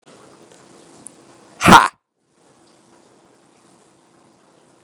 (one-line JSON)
{"exhalation_length": "4.8 s", "exhalation_amplitude": 32768, "exhalation_signal_mean_std_ratio": 0.18, "survey_phase": "beta (2021-08-13 to 2022-03-07)", "age": "45-64", "gender": "Male", "wearing_mask": "No", "symptom_cough_any": true, "symptom_sore_throat": true, "symptom_onset": "3 days", "smoker_status": "Ex-smoker", "respiratory_condition_asthma": false, "respiratory_condition_other": false, "recruitment_source": "Test and Trace", "submission_delay": "2 days", "covid_test_result": "Positive", "covid_test_method": "RT-qPCR", "covid_ct_value": 28.4, "covid_ct_gene": "N gene", "covid_ct_mean": 28.6, "covid_viral_load": "430 copies/ml", "covid_viral_load_category": "Minimal viral load (< 10K copies/ml)"}